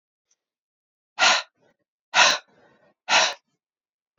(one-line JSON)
{"exhalation_length": "4.2 s", "exhalation_amplitude": 27081, "exhalation_signal_mean_std_ratio": 0.31, "survey_phase": "beta (2021-08-13 to 2022-03-07)", "age": "45-64", "gender": "Female", "wearing_mask": "No", "symptom_runny_or_blocked_nose": true, "symptom_onset": "3 days", "smoker_status": "Ex-smoker", "respiratory_condition_asthma": false, "respiratory_condition_other": false, "recruitment_source": "Test and Trace", "submission_delay": "2 days", "covid_test_result": "Positive", "covid_test_method": "RT-qPCR", "covid_ct_value": 23.3, "covid_ct_gene": "ORF1ab gene"}